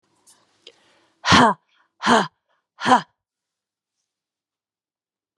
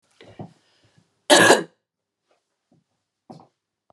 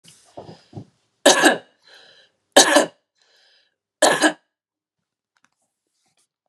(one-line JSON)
{"exhalation_length": "5.4 s", "exhalation_amplitude": 30242, "exhalation_signal_mean_std_ratio": 0.27, "cough_length": "3.9 s", "cough_amplitude": 32398, "cough_signal_mean_std_ratio": 0.23, "three_cough_length": "6.5 s", "three_cough_amplitude": 32768, "three_cough_signal_mean_std_ratio": 0.28, "survey_phase": "beta (2021-08-13 to 2022-03-07)", "age": "18-44", "gender": "Female", "wearing_mask": "No", "symptom_runny_or_blocked_nose": true, "symptom_change_to_sense_of_smell_or_taste": true, "symptom_loss_of_taste": true, "symptom_onset": "3 days", "smoker_status": "Never smoked", "respiratory_condition_asthma": false, "respiratory_condition_other": false, "recruitment_source": "Test and Trace", "submission_delay": "2 days", "covid_test_result": "Positive", "covid_test_method": "RT-qPCR", "covid_ct_value": 18.2, "covid_ct_gene": "ORF1ab gene", "covid_ct_mean": 18.7, "covid_viral_load": "720000 copies/ml", "covid_viral_load_category": "Low viral load (10K-1M copies/ml)"}